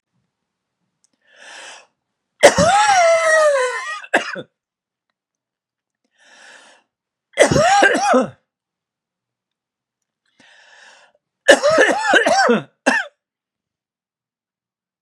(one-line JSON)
{"three_cough_length": "15.0 s", "three_cough_amplitude": 32768, "three_cough_signal_mean_std_ratio": 0.41, "survey_phase": "beta (2021-08-13 to 2022-03-07)", "age": "45-64", "gender": "Male", "wearing_mask": "No", "symptom_new_continuous_cough": true, "symptom_runny_or_blocked_nose": true, "symptom_sore_throat": true, "symptom_change_to_sense_of_smell_or_taste": true, "symptom_onset": "12 days", "smoker_status": "Never smoked", "respiratory_condition_asthma": false, "respiratory_condition_other": false, "recruitment_source": "REACT", "submission_delay": "1 day", "covid_test_result": "Negative", "covid_test_method": "RT-qPCR", "influenza_a_test_result": "Negative", "influenza_b_test_result": "Negative"}